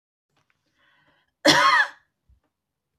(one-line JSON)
{"cough_length": "3.0 s", "cough_amplitude": 28631, "cough_signal_mean_std_ratio": 0.31, "survey_phase": "beta (2021-08-13 to 2022-03-07)", "age": "45-64", "gender": "Female", "wearing_mask": "No", "symptom_none": true, "smoker_status": "Ex-smoker", "respiratory_condition_asthma": false, "respiratory_condition_other": false, "recruitment_source": "REACT", "submission_delay": "0 days", "covid_test_result": "Negative", "covid_test_method": "RT-qPCR"}